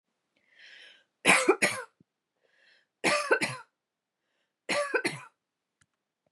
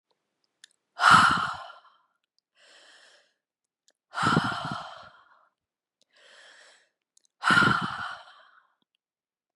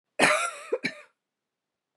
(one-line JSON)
{"three_cough_length": "6.3 s", "three_cough_amplitude": 13094, "three_cough_signal_mean_std_ratio": 0.34, "exhalation_length": "9.6 s", "exhalation_amplitude": 21105, "exhalation_signal_mean_std_ratio": 0.31, "cough_length": "2.0 s", "cough_amplitude": 20350, "cough_signal_mean_std_ratio": 0.38, "survey_phase": "beta (2021-08-13 to 2022-03-07)", "age": "45-64", "gender": "Female", "wearing_mask": "No", "symptom_none": true, "smoker_status": "Never smoked", "respiratory_condition_asthma": false, "respiratory_condition_other": false, "recruitment_source": "REACT", "submission_delay": "6 days", "covid_test_result": "Negative", "covid_test_method": "RT-qPCR"}